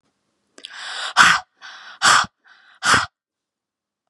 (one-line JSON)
{"exhalation_length": "4.1 s", "exhalation_amplitude": 32768, "exhalation_signal_mean_std_ratio": 0.36, "survey_phase": "beta (2021-08-13 to 2022-03-07)", "age": "18-44", "gender": "Female", "wearing_mask": "No", "symptom_none": true, "smoker_status": "Never smoked", "respiratory_condition_asthma": false, "respiratory_condition_other": false, "recruitment_source": "REACT", "submission_delay": "0 days", "covid_test_result": "Negative", "covid_test_method": "RT-qPCR", "influenza_a_test_result": "Negative", "influenza_b_test_result": "Negative"}